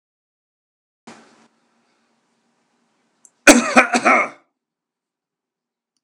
{"cough_length": "6.0 s", "cough_amplitude": 32768, "cough_signal_mean_std_ratio": 0.24, "survey_phase": "alpha (2021-03-01 to 2021-08-12)", "age": "65+", "gender": "Male", "wearing_mask": "No", "symptom_none": true, "smoker_status": "Ex-smoker", "respiratory_condition_asthma": false, "respiratory_condition_other": false, "recruitment_source": "REACT", "submission_delay": "1 day", "covid_test_result": "Negative", "covid_test_method": "RT-qPCR"}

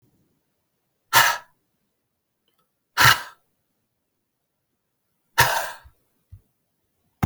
{"exhalation_length": "7.3 s", "exhalation_amplitude": 30132, "exhalation_signal_mean_std_ratio": 0.24, "survey_phase": "beta (2021-08-13 to 2022-03-07)", "age": "65+", "gender": "Male", "wearing_mask": "No", "symptom_none": true, "smoker_status": "Never smoked", "respiratory_condition_asthma": false, "respiratory_condition_other": false, "recruitment_source": "REACT", "submission_delay": "0 days", "covid_test_result": "Negative", "covid_test_method": "RT-qPCR"}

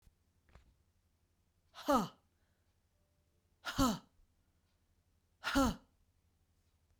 {"exhalation_length": "7.0 s", "exhalation_amplitude": 3551, "exhalation_signal_mean_std_ratio": 0.27, "survey_phase": "beta (2021-08-13 to 2022-03-07)", "age": "45-64", "gender": "Female", "wearing_mask": "No", "symptom_runny_or_blocked_nose": true, "symptom_sore_throat": true, "symptom_headache": true, "symptom_onset": "3 days", "smoker_status": "Ex-smoker", "respiratory_condition_asthma": false, "respiratory_condition_other": false, "recruitment_source": "Test and Trace", "submission_delay": "1 day", "covid_test_result": "Positive", "covid_test_method": "RT-qPCR", "covid_ct_value": 31.0, "covid_ct_gene": "N gene"}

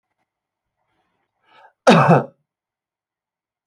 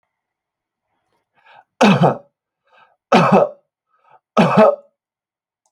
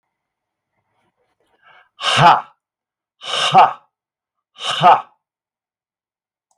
{"cough_length": "3.7 s", "cough_amplitude": 29077, "cough_signal_mean_std_ratio": 0.25, "three_cough_length": "5.7 s", "three_cough_amplitude": 28870, "three_cough_signal_mean_std_ratio": 0.35, "exhalation_length": "6.6 s", "exhalation_amplitude": 28504, "exhalation_signal_mean_std_ratio": 0.31, "survey_phase": "beta (2021-08-13 to 2022-03-07)", "age": "45-64", "gender": "Male", "wearing_mask": "No", "symptom_none": true, "smoker_status": "Never smoked", "respiratory_condition_asthma": false, "respiratory_condition_other": false, "recruitment_source": "REACT", "submission_delay": "0 days", "covid_test_result": "Negative", "covid_test_method": "RT-qPCR", "influenza_a_test_result": "Negative", "influenza_b_test_result": "Negative"}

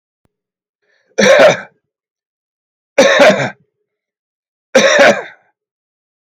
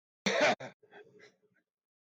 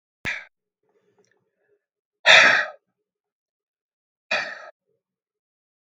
{"three_cough_length": "6.4 s", "three_cough_amplitude": 32768, "three_cough_signal_mean_std_ratio": 0.39, "cough_length": "2.0 s", "cough_amplitude": 5221, "cough_signal_mean_std_ratio": 0.35, "exhalation_length": "5.9 s", "exhalation_amplitude": 32768, "exhalation_signal_mean_std_ratio": 0.24, "survey_phase": "beta (2021-08-13 to 2022-03-07)", "age": "65+", "gender": "Male", "wearing_mask": "No", "symptom_none": true, "smoker_status": "Ex-smoker", "respiratory_condition_asthma": false, "respiratory_condition_other": false, "recruitment_source": "REACT", "submission_delay": "1 day", "covid_test_result": "Negative", "covid_test_method": "RT-qPCR", "influenza_a_test_result": "Negative", "influenza_b_test_result": "Negative"}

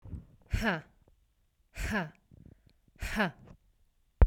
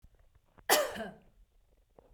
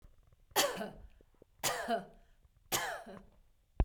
{"exhalation_length": "4.3 s", "exhalation_amplitude": 11797, "exhalation_signal_mean_std_ratio": 0.31, "cough_length": "2.1 s", "cough_amplitude": 9040, "cough_signal_mean_std_ratio": 0.3, "three_cough_length": "3.8 s", "three_cough_amplitude": 5669, "three_cough_signal_mean_std_ratio": 0.42, "survey_phase": "beta (2021-08-13 to 2022-03-07)", "age": "45-64", "gender": "Female", "wearing_mask": "No", "symptom_none": true, "smoker_status": "Ex-smoker", "respiratory_condition_asthma": false, "respiratory_condition_other": false, "recruitment_source": "REACT", "submission_delay": "1 day", "covid_test_result": "Negative", "covid_test_method": "RT-qPCR"}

